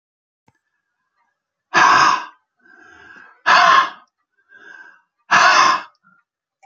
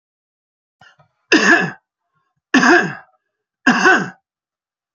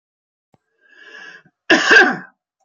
{
  "exhalation_length": "6.7 s",
  "exhalation_amplitude": 30874,
  "exhalation_signal_mean_std_ratio": 0.39,
  "three_cough_length": "4.9 s",
  "three_cough_amplitude": 29242,
  "three_cough_signal_mean_std_ratio": 0.38,
  "cough_length": "2.6 s",
  "cough_amplitude": 32767,
  "cough_signal_mean_std_ratio": 0.34,
  "survey_phase": "beta (2021-08-13 to 2022-03-07)",
  "age": "45-64",
  "gender": "Male",
  "wearing_mask": "No",
  "symptom_none": true,
  "smoker_status": "Never smoked",
  "respiratory_condition_asthma": false,
  "respiratory_condition_other": false,
  "recruitment_source": "REACT",
  "submission_delay": "2 days",
  "covid_test_result": "Negative",
  "covid_test_method": "RT-qPCR",
  "influenza_a_test_result": "Unknown/Void",
  "influenza_b_test_result": "Unknown/Void"
}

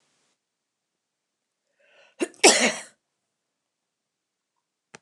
{
  "cough_length": "5.0 s",
  "cough_amplitude": 28670,
  "cough_signal_mean_std_ratio": 0.19,
  "survey_phase": "alpha (2021-03-01 to 2021-08-12)",
  "age": "65+",
  "gender": "Female",
  "wearing_mask": "No",
  "symptom_none": true,
  "smoker_status": "Ex-smoker",
  "respiratory_condition_asthma": false,
  "respiratory_condition_other": false,
  "recruitment_source": "REACT",
  "submission_delay": "2 days",
  "covid_test_result": "Negative",
  "covid_test_method": "RT-qPCR"
}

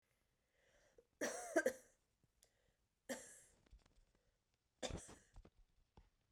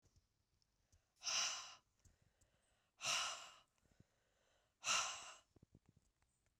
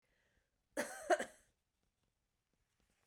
{
  "three_cough_length": "6.3 s",
  "three_cough_amplitude": 2239,
  "three_cough_signal_mean_std_ratio": 0.27,
  "exhalation_length": "6.6 s",
  "exhalation_amplitude": 1678,
  "exhalation_signal_mean_std_ratio": 0.35,
  "cough_length": "3.1 s",
  "cough_amplitude": 2868,
  "cough_signal_mean_std_ratio": 0.23,
  "survey_phase": "beta (2021-08-13 to 2022-03-07)",
  "age": "45-64",
  "gender": "Female",
  "wearing_mask": "No",
  "symptom_cough_any": true,
  "symptom_runny_or_blocked_nose": true,
  "symptom_fatigue": true,
  "symptom_change_to_sense_of_smell_or_taste": true,
  "symptom_loss_of_taste": true,
  "smoker_status": "Never smoked",
  "respiratory_condition_asthma": false,
  "respiratory_condition_other": false,
  "recruitment_source": "Test and Trace",
  "submission_delay": "6 days",
  "covid_test_result": "Positive",
  "covid_test_method": "RT-qPCR",
  "covid_ct_value": 31.5,
  "covid_ct_gene": "ORF1ab gene",
  "covid_ct_mean": 32.5,
  "covid_viral_load": "21 copies/ml",
  "covid_viral_load_category": "Minimal viral load (< 10K copies/ml)"
}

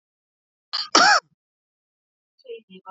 {
  "cough_length": "2.9 s",
  "cough_amplitude": 28098,
  "cough_signal_mean_std_ratio": 0.28,
  "survey_phase": "beta (2021-08-13 to 2022-03-07)",
  "age": "65+",
  "gender": "Male",
  "wearing_mask": "No",
  "symptom_none": true,
  "smoker_status": "Never smoked",
  "respiratory_condition_asthma": false,
  "respiratory_condition_other": false,
  "recruitment_source": "REACT",
  "submission_delay": "1 day",
  "covid_test_result": "Negative",
  "covid_test_method": "RT-qPCR",
  "influenza_a_test_result": "Negative",
  "influenza_b_test_result": "Negative"
}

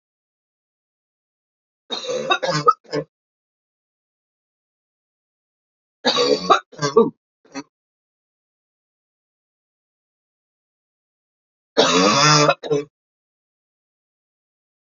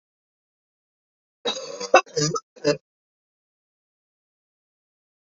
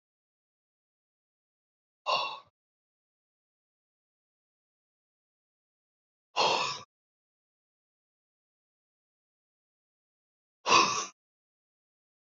{
  "three_cough_length": "14.8 s",
  "three_cough_amplitude": 28628,
  "three_cough_signal_mean_std_ratio": 0.3,
  "cough_length": "5.4 s",
  "cough_amplitude": 27101,
  "cough_signal_mean_std_ratio": 0.23,
  "exhalation_length": "12.4 s",
  "exhalation_amplitude": 11583,
  "exhalation_signal_mean_std_ratio": 0.21,
  "survey_phase": "alpha (2021-03-01 to 2021-08-12)",
  "age": "45-64",
  "gender": "Female",
  "wearing_mask": "No",
  "symptom_cough_any": true,
  "symptom_fatigue": true,
  "symptom_headache": true,
  "symptom_onset": "4 days",
  "smoker_status": "Ex-smoker",
  "respiratory_condition_asthma": false,
  "respiratory_condition_other": false,
  "recruitment_source": "Test and Trace",
  "submission_delay": "2 days",
  "covid_test_result": "Positive",
  "covid_test_method": "ePCR"
}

